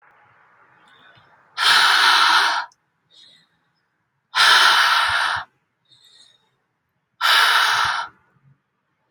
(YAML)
exhalation_length: 9.1 s
exhalation_amplitude: 32504
exhalation_signal_mean_std_ratio: 0.49
survey_phase: beta (2021-08-13 to 2022-03-07)
age: 18-44
gender: Female
wearing_mask: 'No'
symptom_none: true
smoker_status: Never smoked
respiratory_condition_asthma: false
respiratory_condition_other: false
recruitment_source: Test and Trace
submission_delay: 1 day
covid_test_result: Positive
covid_test_method: RT-qPCR
covid_ct_value: 26.3
covid_ct_gene: ORF1ab gene